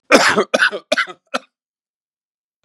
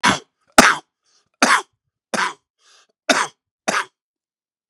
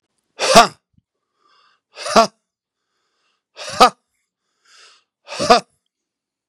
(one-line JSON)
{"cough_length": "2.6 s", "cough_amplitude": 32768, "cough_signal_mean_std_ratio": 0.38, "three_cough_length": "4.7 s", "three_cough_amplitude": 32768, "three_cough_signal_mean_std_ratio": 0.32, "exhalation_length": "6.5 s", "exhalation_amplitude": 32768, "exhalation_signal_mean_std_ratio": 0.25, "survey_phase": "beta (2021-08-13 to 2022-03-07)", "age": "65+", "gender": "Male", "wearing_mask": "No", "symptom_none": true, "smoker_status": "Ex-smoker", "respiratory_condition_asthma": false, "respiratory_condition_other": false, "recruitment_source": "REACT", "submission_delay": "1 day", "covid_test_result": "Negative", "covid_test_method": "RT-qPCR", "influenza_a_test_result": "Negative", "influenza_b_test_result": "Negative"}